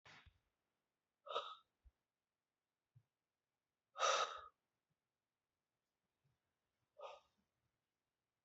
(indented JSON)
{
  "exhalation_length": "8.4 s",
  "exhalation_amplitude": 2049,
  "exhalation_signal_mean_std_ratio": 0.22,
  "survey_phase": "beta (2021-08-13 to 2022-03-07)",
  "age": "65+",
  "gender": "Male",
  "wearing_mask": "No",
  "symptom_none": true,
  "symptom_onset": "12 days",
  "smoker_status": "Never smoked",
  "respiratory_condition_asthma": false,
  "respiratory_condition_other": false,
  "recruitment_source": "REACT",
  "submission_delay": "3 days",
  "covid_test_result": "Negative",
  "covid_test_method": "RT-qPCR",
  "influenza_a_test_result": "Negative",
  "influenza_b_test_result": "Negative"
}